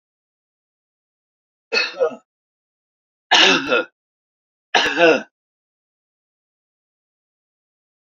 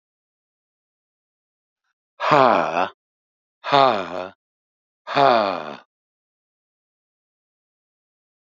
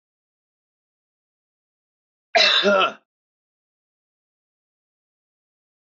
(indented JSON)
{
  "three_cough_length": "8.1 s",
  "three_cough_amplitude": 30347,
  "three_cough_signal_mean_std_ratio": 0.29,
  "exhalation_length": "8.4 s",
  "exhalation_amplitude": 28966,
  "exhalation_signal_mean_std_ratio": 0.3,
  "cough_length": "5.9 s",
  "cough_amplitude": 21060,
  "cough_signal_mean_std_ratio": 0.25,
  "survey_phase": "beta (2021-08-13 to 2022-03-07)",
  "age": "65+",
  "gender": "Male",
  "wearing_mask": "No",
  "symptom_runny_or_blocked_nose": true,
  "smoker_status": "Ex-smoker",
  "respiratory_condition_asthma": false,
  "respiratory_condition_other": false,
  "recruitment_source": "REACT",
  "submission_delay": "3 days",
  "covid_test_result": "Negative",
  "covid_test_method": "RT-qPCR",
  "influenza_a_test_result": "Negative",
  "influenza_b_test_result": "Negative"
}